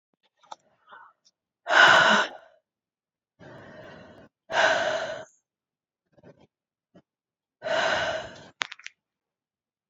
{"exhalation_length": "9.9 s", "exhalation_amplitude": 24980, "exhalation_signal_mean_std_ratio": 0.33, "survey_phase": "beta (2021-08-13 to 2022-03-07)", "age": "45-64", "gender": "Female", "wearing_mask": "No", "symptom_new_continuous_cough": true, "symptom_runny_or_blocked_nose": true, "symptom_shortness_of_breath": true, "symptom_sore_throat": true, "symptom_fatigue": true, "symptom_headache": true, "symptom_change_to_sense_of_smell_or_taste": true, "symptom_onset": "4 days", "smoker_status": "Never smoked", "respiratory_condition_asthma": false, "respiratory_condition_other": false, "recruitment_source": "Test and Trace", "submission_delay": "2 days", "covid_test_result": "Positive", "covid_test_method": "RT-qPCR", "covid_ct_value": 21.9, "covid_ct_gene": "N gene", "covid_ct_mean": 22.4, "covid_viral_load": "45000 copies/ml", "covid_viral_load_category": "Low viral load (10K-1M copies/ml)"}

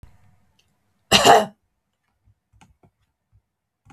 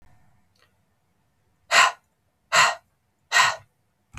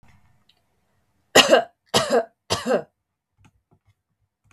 {"cough_length": "3.9 s", "cough_amplitude": 32768, "cough_signal_mean_std_ratio": 0.23, "exhalation_length": "4.2 s", "exhalation_amplitude": 22568, "exhalation_signal_mean_std_ratio": 0.31, "three_cough_length": "4.5 s", "three_cough_amplitude": 32768, "three_cough_signal_mean_std_ratio": 0.3, "survey_phase": "beta (2021-08-13 to 2022-03-07)", "age": "18-44", "gender": "Female", "wearing_mask": "No", "symptom_none": true, "smoker_status": "Ex-smoker", "respiratory_condition_asthma": false, "respiratory_condition_other": false, "recruitment_source": "REACT", "submission_delay": "1 day", "covid_test_result": "Negative", "covid_test_method": "RT-qPCR", "influenza_a_test_result": "Negative", "influenza_b_test_result": "Negative"}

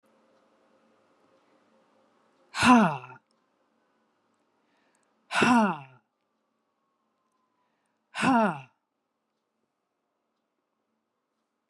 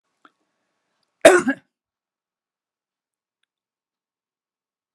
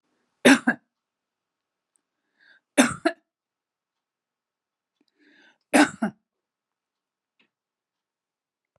{"exhalation_length": "11.7 s", "exhalation_amplitude": 15285, "exhalation_signal_mean_std_ratio": 0.24, "cough_length": "4.9 s", "cough_amplitude": 32768, "cough_signal_mean_std_ratio": 0.15, "three_cough_length": "8.8 s", "three_cough_amplitude": 24813, "three_cough_signal_mean_std_ratio": 0.19, "survey_phase": "beta (2021-08-13 to 2022-03-07)", "age": "65+", "gender": "Female", "wearing_mask": "No", "symptom_none": true, "smoker_status": "Ex-smoker", "respiratory_condition_asthma": false, "respiratory_condition_other": false, "recruitment_source": "REACT", "submission_delay": "10 days", "covid_test_result": "Negative", "covid_test_method": "RT-qPCR"}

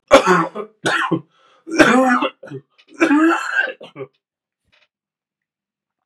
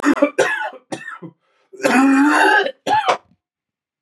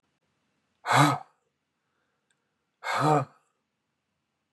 {"three_cough_length": "6.1 s", "three_cough_amplitude": 32768, "three_cough_signal_mean_std_ratio": 0.46, "cough_length": "4.0 s", "cough_amplitude": 28842, "cough_signal_mean_std_ratio": 0.6, "exhalation_length": "4.5 s", "exhalation_amplitude": 15215, "exhalation_signal_mean_std_ratio": 0.3, "survey_phase": "beta (2021-08-13 to 2022-03-07)", "age": "45-64", "gender": "Male", "wearing_mask": "No", "symptom_cough_any": true, "symptom_runny_or_blocked_nose": true, "symptom_fever_high_temperature": true, "symptom_headache": true, "symptom_change_to_sense_of_smell_or_taste": true, "symptom_loss_of_taste": true, "symptom_onset": "3 days", "smoker_status": "Never smoked", "respiratory_condition_asthma": false, "respiratory_condition_other": false, "recruitment_source": "Test and Trace", "submission_delay": "1 day", "covid_test_result": "Positive", "covid_test_method": "RT-qPCR"}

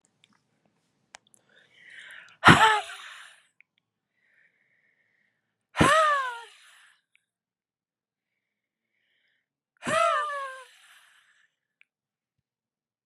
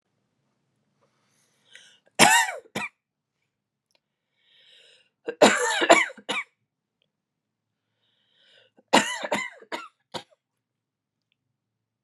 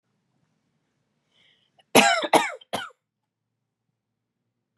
{"exhalation_length": "13.1 s", "exhalation_amplitude": 28321, "exhalation_signal_mean_std_ratio": 0.26, "three_cough_length": "12.0 s", "three_cough_amplitude": 31809, "three_cough_signal_mean_std_ratio": 0.25, "cough_length": "4.8 s", "cough_amplitude": 30873, "cough_signal_mean_std_ratio": 0.24, "survey_phase": "beta (2021-08-13 to 2022-03-07)", "age": "45-64", "gender": "Female", "wearing_mask": "No", "symptom_cough_any": true, "symptom_runny_or_blocked_nose": true, "symptom_shortness_of_breath": true, "symptom_sore_throat": true, "symptom_fatigue": true, "symptom_fever_high_temperature": true, "symptom_headache": true, "symptom_onset": "6 days", "smoker_status": "Never smoked", "respiratory_condition_asthma": true, "respiratory_condition_other": false, "recruitment_source": "Test and Trace", "submission_delay": "2 days", "covid_test_result": "Positive", "covid_test_method": "RT-qPCR", "covid_ct_value": 32.2, "covid_ct_gene": "ORF1ab gene", "covid_ct_mean": 32.8, "covid_viral_load": "18 copies/ml", "covid_viral_load_category": "Minimal viral load (< 10K copies/ml)"}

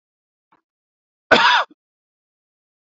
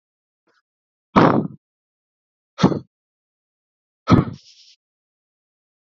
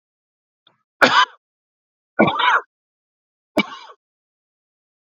{"cough_length": "2.8 s", "cough_amplitude": 32767, "cough_signal_mean_std_ratio": 0.27, "exhalation_length": "5.9 s", "exhalation_amplitude": 29126, "exhalation_signal_mean_std_ratio": 0.24, "three_cough_length": "5.0 s", "three_cough_amplitude": 29790, "three_cough_signal_mean_std_ratio": 0.29, "survey_phase": "beta (2021-08-13 to 2022-03-07)", "age": "45-64", "gender": "Male", "wearing_mask": "No", "symptom_fatigue": true, "symptom_onset": "12 days", "smoker_status": "Never smoked", "respiratory_condition_asthma": false, "respiratory_condition_other": false, "recruitment_source": "REACT", "submission_delay": "0 days", "covid_test_result": "Negative", "covid_test_method": "RT-qPCR", "influenza_a_test_result": "Negative", "influenza_b_test_result": "Negative"}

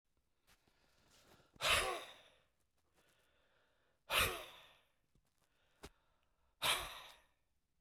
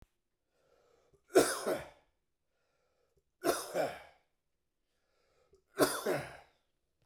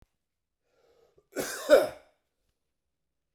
{"exhalation_length": "7.8 s", "exhalation_amplitude": 3278, "exhalation_signal_mean_std_ratio": 0.3, "three_cough_length": "7.1 s", "three_cough_amplitude": 8349, "three_cough_signal_mean_std_ratio": 0.3, "cough_length": "3.3 s", "cough_amplitude": 14982, "cough_signal_mean_std_ratio": 0.22, "survey_phase": "beta (2021-08-13 to 2022-03-07)", "age": "65+", "gender": "Male", "wearing_mask": "No", "symptom_none": true, "smoker_status": "Never smoked", "respiratory_condition_asthma": false, "respiratory_condition_other": false, "recruitment_source": "REACT", "submission_delay": "0 days", "covid_test_result": "Negative", "covid_test_method": "RT-qPCR"}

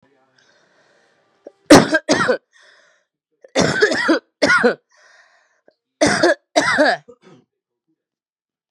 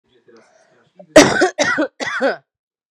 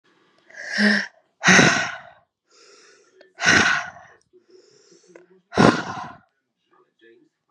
{"three_cough_length": "8.7 s", "three_cough_amplitude": 32768, "three_cough_signal_mean_std_ratio": 0.38, "cough_length": "2.9 s", "cough_amplitude": 32768, "cough_signal_mean_std_ratio": 0.4, "exhalation_length": "7.5 s", "exhalation_amplitude": 32767, "exhalation_signal_mean_std_ratio": 0.36, "survey_phase": "beta (2021-08-13 to 2022-03-07)", "age": "18-44", "gender": "Male", "wearing_mask": "No", "symptom_abdominal_pain": true, "symptom_fatigue": true, "symptom_headache": true, "smoker_status": "Current smoker (1 to 10 cigarettes per day)", "respiratory_condition_asthma": false, "respiratory_condition_other": false, "recruitment_source": "Test and Trace", "submission_delay": "3 days", "covid_test_result": "Positive", "covid_test_method": "ePCR"}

